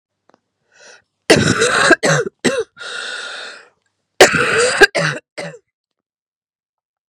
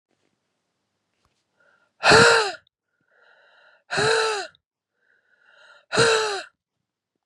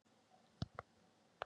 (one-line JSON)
{"cough_length": "7.1 s", "cough_amplitude": 32768, "cough_signal_mean_std_ratio": 0.43, "exhalation_length": "7.3 s", "exhalation_amplitude": 29817, "exhalation_signal_mean_std_ratio": 0.34, "three_cough_length": "1.5 s", "three_cough_amplitude": 1981, "three_cough_signal_mean_std_ratio": 0.22, "survey_phase": "beta (2021-08-13 to 2022-03-07)", "age": "18-44", "gender": "Female", "wearing_mask": "No", "symptom_cough_any": true, "symptom_runny_or_blocked_nose": true, "symptom_shortness_of_breath": true, "symptom_sore_throat": true, "symptom_diarrhoea": true, "symptom_fatigue": true, "symptom_headache": true, "symptom_other": true, "symptom_onset": "3 days", "smoker_status": "Never smoked", "respiratory_condition_asthma": false, "respiratory_condition_other": false, "recruitment_source": "Test and Trace", "submission_delay": "2 days", "covid_test_result": "Positive", "covid_test_method": "RT-qPCR", "covid_ct_value": 23.1, "covid_ct_gene": "ORF1ab gene"}